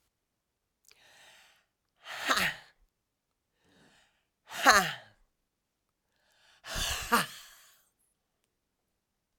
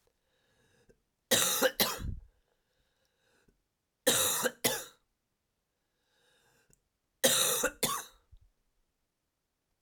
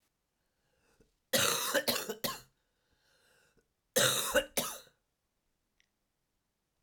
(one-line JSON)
{"exhalation_length": "9.4 s", "exhalation_amplitude": 17683, "exhalation_signal_mean_std_ratio": 0.25, "three_cough_length": "9.8 s", "three_cough_amplitude": 9801, "three_cough_signal_mean_std_ratio": 0.35, "cough_length": "6.8 s", "cough_amplitude": 8489, "cough_signal_mean_std_ratio": 0.36, "survey_phase": "alpha (2021-03-01 to 2021-08-12)", "age": "45-64", "gender": "Female", "wearing_mask": "No", "symptom_cough_any": true, "smoker_status": "Never smoked", "respiratory_condition_asthma": false, "respiratory_condition_other": false, "recruitment_source": "REACT", "submission_delay": "2 days", "covid_test_result": "Negative", "covid_test_method": "RT-qPCR"}